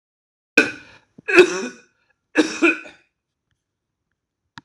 {
  "three_cough_length": "4.6 s",
  "three_cough_amplitude": 26028,
  "three_cough_signal_mean_std_ratio": 0.29,
  "survey_phase": "alpha (2021-03-01 to 2021-08-12)",
  "age": "45-64",
  "gender": "Male",
  "wearing_mask": "No",
  "symptom_cough_any": true,
  "symptom_fatigue": true,
  "symptom_headache": true,
  "smoker_status": "Never smoked",
  "respiratory_condition_asthma": false,
  "respiratory_condition_other": true,
  "recruitment_source": "Test and Trace",
  "submission_delay": "2 days",
  "covid_test_result": "Positive",
  "covid_test_method": "LFT"
}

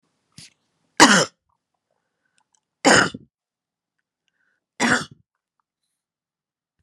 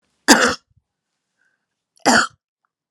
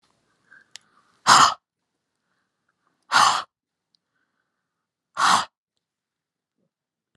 {
  "three_cough_length": "6.8 s",
  "three_cough_amplitude": 32768,
  "three_cough_signal_mean_std_ratio": 0.24,
  "cough_length": "2.9 s",
  "cough_amplitude": 32768,
  "cough_signal_mean_std_ratio": 0.3,
  "exhalation_length": "7.2 s",
  "exhalation_amplitude": 30120,
  "exhalation_signal_mean_std_ratio": 0.25,
  "survey_phase": "alpha (2021-03-01 to 2021-08-12)",
  "age": "65+",
  "gender": "Female",
  "wearing_mask": "No",
  "symptom_none": true,
  "smoker_status": "Never smoked",
  "respiratory_condition_asthma": false,
  "respiratory_condition_other": false,
  "recruitment_source": "REACT",
  "submission_delay": "17 days",
  "covid_test_result": "Negative",
  "covid_test_method": "RT-qPCR"
}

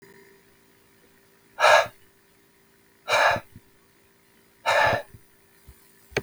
{
  "exhalation_length": "6.2 s",
  "exhalation_amplitude": 21469,
  "exhalation_signal_mean_std_ratio": 0.33,
  "survey_phase": "beta (2021-08-13 to 2022-03-07)",
  "age": "45-64",
  "gender": "Male",
  "wearing_mask": "No",
  "symptom_none": true,
  "smoker_status": "Ex-smoker",
  "respiratory_condition_asthma": false,
  "respiratory_condition_other": false,
  "recruitment_source": "REACT",
  "submission_delay": "2 days",
  "covid_test_result": "Negative",
  "covid_test_method": "RT-qPCR",
  "influenza_a_test_result": "Negative",
  "influenza_b_test_result": "Negative"
}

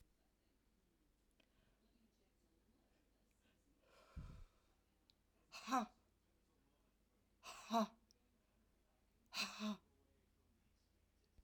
{
  "exhalation_length": "11.4 s",
  "exhalation_amplitude": 1284,
  "exhalation_signal_mean_std_ratio": 0.26,
  "survey_phase": "alpha (2021-03-01 to 2021-08-12)",
  "age": "65+",
  "gender": "Female",
  "wearing_mask": "No",
  "symptom_none": true,
  "smoker_status": "Never smoked",
  "respiratory_condition_asthma": false,
  "respiratory_condition_other": false,
  "recruitment_source": "REACT",
  "submission_delay": "2 days",
  "covid_test_result": "Negative",
  "covid_test_method": "RT-qPCR"
}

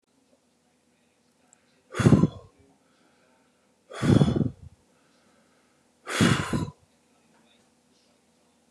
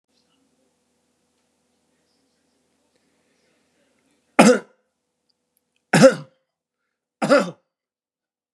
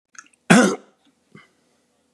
{
  "exhalation_length": "8.7 s",
  "exhalation_amplitude": 22823,
  "exhalation_signal_mean_std_ratio": 0.29,
  "three_cough_length": "8.5 s",
  "three_cough_amplitude": 32767,
  "three_cough_signal_mean_std_ratio": 0.2,
  "cough_length": "2.1 s",
  "cough_amplitude": 32556,
  "cough_signal_mean_std_ratio": 0.27,
  "survey_phase": "beta (2021-08-13 to 2022-03-07)",
  "age": "45-64",
  "gender": "Male",
  "wearing_mask": "No",
  "symptom_none": true,
  "smoker_status": "Never smoked",
  "respiratory_condition_asthma": false,
  "respiratory_condition_other": false,
  "recruitment_source": "REACT",
  "submission_delay": "1 day",
  "covid_test_result": "Negative",
  "covid_test_method": "RT-qPCR",
  "influenza_a_test_result": "Negative",
  "influenza_b_test_result": "Negative"
}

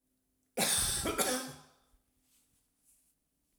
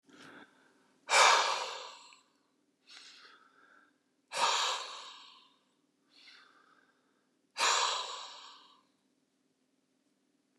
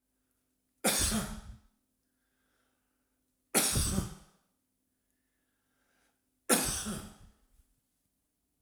{
  "cough_length": "3.6 s",
  "cough_amplitude": 4866,
  "cough_signal_mean_std_ratio": 0.42,
  "exhalation_length": "10.6 s",
  "exhalation_amplitude": 9400,
  "exhalation_signal_mean_std_ratio": 0.33,
  "three_cough_length": "8.6 s",
  "three_cough_amplitude": 9500,
  "three_cough_signal_mean_std_ratio": 0.34,
  "survey_phase": "alpha (2021-03-01 to 2021-08-12)",
  "age": "45-64",
  "gender": "Male",
  "wearing_mask": "No",
  "symptom_none": true,
  "smoker_status": "Never smoked",
  "respiratory_condition_asthma": false,
  "respiratory_condition_other": false,
  "recruitment_source": "REACT",
  "submission_delay": "1 day",
  "covid_test_result": "Negative",
  "covid_test_method": "RT-qPCR"
}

